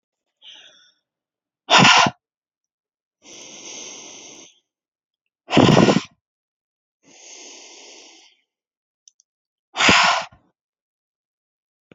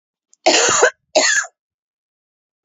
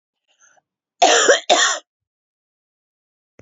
{"exhalation_length": "11.9 s", "exhalation_amplitude": 28366, "exhalation_signal_mean_std_ratio": 0.28, "three_cough_length": "2.6 s", "three_cough_amplitude": 28851, "three_cough_signal_mean_std_ratio": 0.44, "cough_length": "3.4 s", "cough_amplitude": 29365, "cough_signal_mean_std_ratio": 0.35, "survey_phase": "beta (2021-08-13 to 2022-03-07)", "age": "45-64", "gender": "Female", "wearing_mask": "No", "symptom_cough_any": true, "symptom_runny_or_blocked_nose": true, "symptom_fatigue": true, "symptom_change_to_sense_of_smell_or_taste": true, "symptom_loss_of_taste": true, "smoker_status": "Never smoked", "respiratory_condition_asthma": false, "respiratory_condition_other": false, "recruitment_source": "Test and Trace", "submission_delay": "2 days", "covid_test_result": "Positive", "covid_test_method": "LFT"}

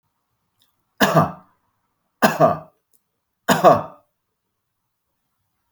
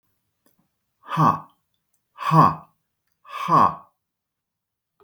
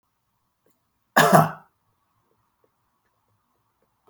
{"three_cough_length": "5.7 s", "three_cough_amplitude": 32768, "three_cough_signal_mean_std_ratio": 0.3, "exhalation_length": "5.0 s", "exhalation_amplitude": 24931, "exhalation_signal_mean_std_ratio": 0.33, "cough_length": "4.1 s", "cough_amplitude": 32766, "cough_signal_mean_std_ratio": 0.22, "survey_phase": "beta (2021-08-13 to 2022-03-07)", "age": "65+", "gender": "Male", "wearing_mask": "No", "symptom_none": true, "smoker_status": "Never smoked", "respiratory_condition_asthma": false, "respiratory_condition_other": false, "recruitment_source": "REACT", "submission_delay": "2 days", "covid_test_result": "Negative", "covid_test_method": "RT-qPCR", "influenza_a_test_result": "Negative", "influenza_b_test_result": "Negative"}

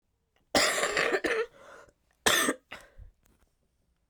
{"cough_length": "4.1 s", "cough_amplitude": 11003, "cough_signal_mean_std_ratio": 0.44, "survey_phase": "beta (2021-08-13 to 2022-03-07)", "age": "45-64", "gender": "Female", "wearing_mask": "No", "symptom_cough_any": true, "symptom_new_continuous_cough": true, "symptom_shortness_of_breath": true, "symptom_change_to_sense_of_smell_or_taste": true, "smoker_status": "Never smoked", "respiratory_condition_asthma": true, "respiratory_condition_other": false, "recruitment_source": "Test and Trace", "submission_delay": "2 days", "covid_test_result": "Positive", "covid_test_method": "LFT"}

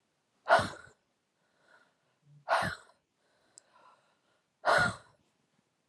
{"exhalation_length": "5.9 s", "exhalation_amplitude": 10628, "exhalation_signal_mean_std_ratio": 0.28, "survey_phase": "alpha (2021-03-01 to 2021-08-12)", "age": "18-44", "gender": "Female", "wearing_mask": "No", "symptom_cough_any": true, "symptom_onset": "4 days", "smoker_status": "Never smoked", "respiratory_condition_asthma": false, "respiratory_condition_other": false, "recruitment_source": "Test and Trace", "submission_delay": "2 days", "covid_test_result": "Positive", "covid_test_method": "RT-qPCR", "covid_ct_value": 19.1, "covid_ct_gene": "N gene", "covid_ct_mean": 19.2, "covid_viral_load": "490000 copies/ml", "covid_viral_load_category": "Low viral load (10K-1M copies/ml)"}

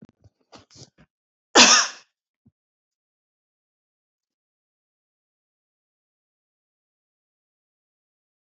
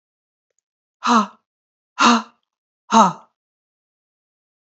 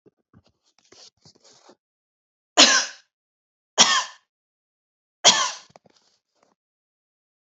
{"cough_length": "8.4 s", "cough_amplitude": 30045, "cough_signal_mean_std_ratio": 0.15, "exhalation_length": "4.7 s", "exhalation_amplitude": 28256, "exhalation_signal_mean_std_ratio": 0.29, "three_cough_length": "7.4 s", "three_cough_amplitude": 32768, "three_cough_signal_mean_std_ratio": 0.24, "survey_phase": "alpha (2021-03-01 to 2021-08-12)", "age": "45-64", "gender": "Female", "wearing_mask": "No", "symptom_headache": true, "smoker_status": "Never smoked", "respiratory_condition_asthma": false, "respiratory_condition_other": false, "recruitment_source": "REACT", "submission_delay": "2 days", "covid_test_result": "Negative", "covid_test_method": "RT-qPCR"}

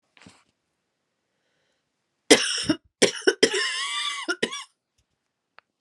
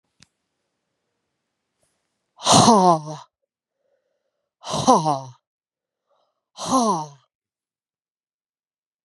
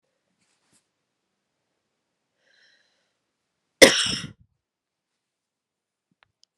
{"three_cough_length": "5.8 s", "three_cough_amplitude": 32745, "three_cough_signal_mean_std_ratio": 0.33, "exhalation_length": "9.0 s", "exhalation_amplitude": 31227, "exhalation_signal_mean_std_ratio": 0.3, "cough_length": "6.6 s", "cough_amplitude": 32768, "cough_signal_mean_std_ratio": 0.14, "survey_phase": "beta (2021-08-13 to 2022-03-07)", "age": "45-64", "gender": "Female", "wearing_mask": "No", "symptom_change_to_sense_of_smell_or_taste": true, "symptom_onset": "4 days", "smoker_status": "Never smoked", "respiratory_condition_asthma": false, "respiratory_condition_other": false, "recruitment_source": "Test and Trace", "submission_delay": "2 days", "covid_test_result": "Positive", "covid_test_method": "RT-qPCR", "covid_ct_value": 20.6, "covid_ct_gene": "ORF1ab gene"}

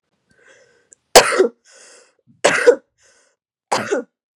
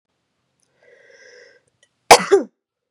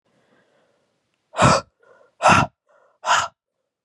{"three_cough_length": "4.4 s", "three_cough_amplitude": 32768, "three_cough_signal_mean_std_ratio": 0.31, "cough_length": "2.9 s", "cough_amplitude": 32768, "cough_signal_mean_std_ratio": 0.21, "exhalation_length": "3.8 s", "exhalation_amplitude": 28876, "exhalation_signal_mean_std_ratio": 0.33, "survey_phase": "beta (2021-08-13 to 2022-03-07)", "age": "18-44", "gender": "Female", "wearing_mask": "No", "symptom_cough_any": true, "symptom_runny_or_blocked_nose": true, "symptom_sore_throat": true, "symptom_onset": "4 days", "smoker_status": "Never smoked", "respiratory_condition_asthma": false, "respiratory_condition_other": false, "recruitment_source": "Test and Trace", "submission_delay": "2 days", "covid_test_result": "Negative", "covid_test_method": "RT-qPCR"}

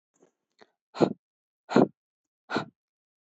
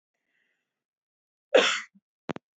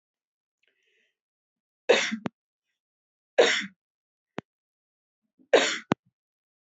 {"exhalation_length": "3.2 s", "exhalation_amplitude": 19489, "exhalation_signal_mean_std_ratio": 0.22, "cough_length": "2.6 s", "cough_amplitude": 17420, "cough_signal_mean_std_ratio": 0.23, "three_cough_length": "6.7 s", "three_cough_amplitude": 21017, "three_cough_signal_mean_std_ratio": 0.24, "survey_phase": "beta (2021-08-13 to 2022-03-07)", "age": "18-44", "gender": "Female", "wearing_mask": "No", "symptom_none": true, "smoker_status": "Ex-smoker", "respiratory_condition_asthma": false, "respiratory_condition_other": false, "recruitment_source": "REACT", "submission_delay": "1 day", "covid_test_result": "Negative", "covid_test_method": "RT-qPCR"}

